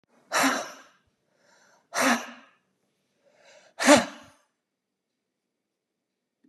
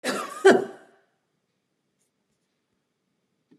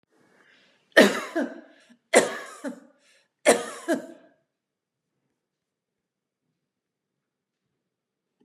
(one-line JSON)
{"exhalation_length": "6.5 s", "exhalation_amplitude": 28677, "exhalation_signal_mean_std_ratio": 0.26, "cough_length": "3.6 s", "cough_amplitude": 21199, "cough_signal_mean_std_ratio": 0.23, "three_cough_length": "8.4 s", "three_cough_amplitude": 29241, "three_cough_signal_mean_std_ratio": 0.24, "survey_phase": "beta (2021-08-13 to 2022-03-07)", "age": "65+", "gender": "Female", "wearing_mask": "No", "symptom_none": true, "smoker_status": "Never smoked", "respiratory_condition_asthma": false, "respiratory_condition_other": false, "recruitment_source": "REACT", "submission_delay": "1 day", "covid_test_result": "Negative", "covid_test_method": "RT-qPCR", "influenza_a_test_result": "Unknown/Void", "influenza_b_test_result": "Unknown/Void"}